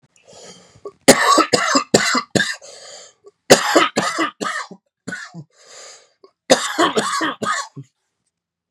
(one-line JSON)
{"three_cough_length": "8.7 s", "three_cough_amplitude": 32768, "three_cough_signal_mean_std_ratio": 0.44, "survey_phase": "beta (2021-08-13 to 2022-03-07)", "age": "18-44", "gender": "Male", "wearing_mask": "No", "symptom_cough_any": true, "symptom_runny_or_blocked_nose": true, "symptom_shortness_of_breath": true, "symptom_fatigue": true, "symptom_fever_high_temperature": true, "symptom_change_to_sense_of_smell_or_taste": true, "smoker_status": "Never smoked", "respiratory_condition_asthma": true, "respiratory_condition_other": false, "recruitment_source": "Test and Trace", "submission_delay": "2 days", "covid_test_result": "Positive", "covid_test_method": "LFT"}